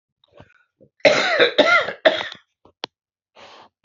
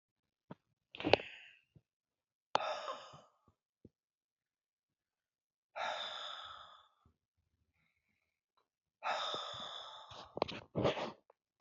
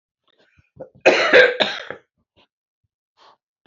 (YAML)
three_cough_length: 3.8 s
three_cough_amplitude: 28594
three_cough_signal_mean_std_ratio: 0.39
exhalation_length: 11.6 s
exhalation_amplitude: 13349
exhalation_signal_mean_std_ratio: 0.31
cough_length: 3.7 s
cough_amplitude: 28855
cough_signal_mean_std_ratio: 0.31
survey_phase: beta (2021-08-13 to 2022-03-07)
age: 45-64
gender: Female
wearing_mask: 'No'
symptom_none: true
smoker_status: Ex-smoker
respiratory_condition_asthma: false
respiratory_condition_other: false
recruitment_source: REACT
submission_delay: 3 days
covid_test_result: Negative
covid_test_method: RT-qPCR